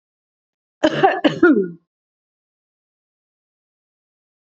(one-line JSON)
{"cough_length": "4.5 s", "cough_amplitude": 30076, "cough_signal_mean_std_ratio": 0.29, "survey_phase": "beta (2021-08-13 to 2022-03-07)", "age": "65+", "gender": "Female", "wearing_mask": "No", "symptom_none": true, "smoker_status": "Ex-smoker", "respiratory_condition_asthma": false, "respiratory_condition_other": false, "recruitment_source": "REACT", "submission_delay": "1 day", "covid_test_result": "Negative", "covid_test_method": "RT-qPCR", "influenza_a_test_result": "Negative", "influenza_b_test_result": "Negative"}